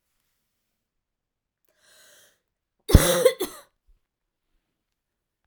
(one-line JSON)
{"cough_length": "5.5 s", "cough_amplitude": 32768, "cough_signal_mean_std_ratio": 0.19, "survey_phase": "alpha (2021-03-01 to 2021-08-12)", "age": "18-44", "gender": "Female", "wearing_mask": "No", "symptom_cough_any": true, "symptom_new_continuous_cough": true, "symptom_fatigue": true, "symptom_headache": true, "symptom_change_to_sense_of_smell_or_taste": true, "symptom_onset": "2 days", "smoker_status": "Never smoked", "respiratory_condition_asthma": false, "respiratory_condition_other": false, "recruitment_source": "Test and Trace", "submission_delay": "2 days", "covid_test_result": "Positive", "covid_test_method": "RT-qPCR", "covid_ct_value": 18.3, "covid_ct_gene": "ORF1ab gene", "covid_ct_mean": 19.4, "covid_viral_load": "430000 copies/ml", "covid_viral_load_category": "Low viral load (10K-1M copies/ml)"}